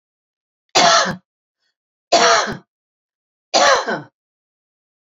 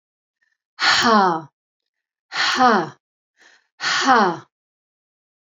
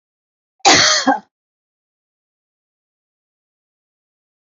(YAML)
three_cough_length: 5.0 s
three_cough_amplitude: 32767
three_cough_signal_mean_std_ratio: 0.39
exhalation_length: 5.5 s
exhalation_amplitude: 27785
exhalation_signal_mean_std_ratio: 0.44
cough_length: 4.5 s
cough_amplitude: 32733
cough_signal_mean_std_ratio: 0.26
survey_phase: beta (2021-08-13 to 2022-03-07)
age: 45-64
gender: Female
wearing_mask: 'No'
symptom_none: true
smoker_status: Never smoked
respiratory_condition_asthma: false
respiratory_condition_other: false
recruitment_source: REACT
submission_delay: 8 days
covid_test_result: Negative
covid_test_method: RT-qPCR
influenza_a_test_result: Unknown/Void
influenza_b_test_result: Unknown/Void